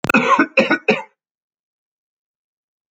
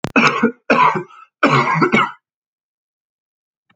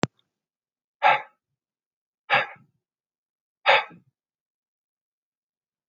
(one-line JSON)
{"cough_length": "2.9 s", "cough_amplitude": 29157, "cough_signal_mean_std_ratio": 0.37, "three_cough_length": "3.8 s", "three_cough_amplitude": 29382, "three_cough_signal_mean_std_ratio": 0.49, "exhalation_length": "5.9 s", "exhalation_amplitude": 28052, "exhalation_signal_mean_std_ratio": 0.22, "survey_phase": "alpha (2021-03-01 to 2021-08-12)", "age": "18-44", "gender": "Male", "wearing_mask": "No", "symptom_cough_any": true, "symptom_shortness_of_breath": true, "symptom_fatigue": true, "symptom_fever_high_temperature": true, "symptom_headache": true, "symptom_change_to_sense_of_smell_or_taste": true, "symptom_loss_of_taste": true, "symptom_onset": "4 days", "smoker_status": "Never smoked", "respiratory_condition_asthma": false, "respiratory_condition_other": false, "recruitment_source": "Test and Trace", "submission_delay": "2 days", "covid_test_result": "Positive", "covid_test_method": "RT-qPCR", "covid_ct_value": 16.4, "covid_ct_gene": "ORF1ab gene", "covid_ct_mean": 17.2, "covid_viral_load": "2300000 copies/ml", "covid_viral_load_category": "High viral load (>1M copies/ml)"}